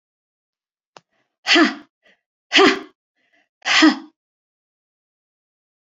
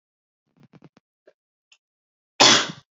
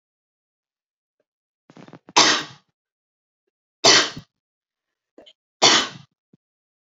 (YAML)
exhalation_length: 6.0 s
exhalation_amplitude: 31535
exhalation_signal_mean_std_ratio: 0.29
cough_length: 2.9 s
cough_amplitude: 30747
cough_signal_mean_std_ratio: 0.23
three_cough_length: 6.8 s
three_cough_amplitude: 31393
three_cough_signal_mean_std_ratio: 0.26
survey_phase: beta (2021-08-13 to 2022-03-07)
age: 18-44
gender: Female
wearing_mask: 'No'
symptom_none: true
smoker_status: Never smoked
respiratory_condition_asthma: false
respiratory_condition_other: false
recruitment_source: REACT
submission_delay: 2 days
covid_test_result: Negative
covid_test_method: RT-qPCR
influenza_a_test_result: Negative
influenza_b_test_result: Negative